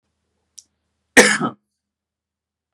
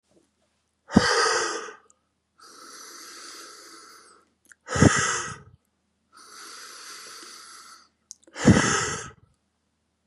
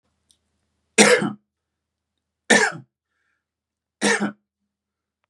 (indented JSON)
{
  "cough_length": "2.7 s",
  "cough_amplitude": 32768,
  "cough_signal_mean_std_ratio": 0.22,
  "exhalation_length": "10.1 s",
  "exhalation_amplitude": 29549,
  "exhalation_signal_mean_std_ratio": 0.34,
  "three_cough_length": "5.3 s",
  "three_cough_amplitude": 32690,
  "three_cough_signal_mean_std_ratio": 0.29,
  "survey_phase": "beta (2021-08-13 to 2022-03-07)",
  "age": "18-44",
  "gender": "Male",
  "wearing_mask": "No",
  "symptom_runny_or_blocked_nose": true,
  "smoker_status": "Never smoked",
  "respiratory_condition_asthma": false,
  "respiratory_condition_other": false,
  "recruitment_source": "REACT",
  "submission_delay": "1 day",
  "covid_test_result": "Negative",
  "covid_test_method": "RT-qPCR",
  "influenza_a_test_result": "Negative",
  "influenza_b_test_result": "Negative"
}